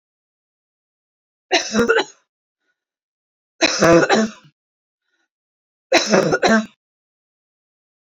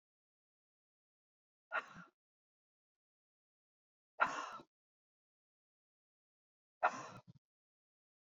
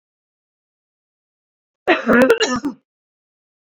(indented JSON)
{
  "three_cough_length": "8.1 s",
  "three_cough_amplitude": 29328,
  "three_cough_signal_mean_std_ratio": 0.36,
  "exhalation_length": "8.3 s",
  "exhalation_amplitude": 3768,
  "exhalation_signal_mean_std_ratio": 0.19,
  "cough_length": "3.8 s",
  "cough_amplitude": 29575,
  "cough_signal_mean_std_ratio": 0.33,
  "survey_phase": "beta (2021-08-13 to 2022-03-07)",
  "age": "45-64",
  "gender": "Female",
  "wearing_mask": "No",
  "symptom_runny_or_blocked_nose": true,
  "symptom_fatigue": true,
  "symptom_headache": true,
  "smoker_status": "Never smoked",
  "respiratory_condition_asthma": false,
  "respiratory_condition_other": false,
  "recruitment_source": "Test and Trace",
  "submission_delay": "2 days",
  "covid_test_result": "Positive",
  "covid_test_method": "RT-qPCR"
}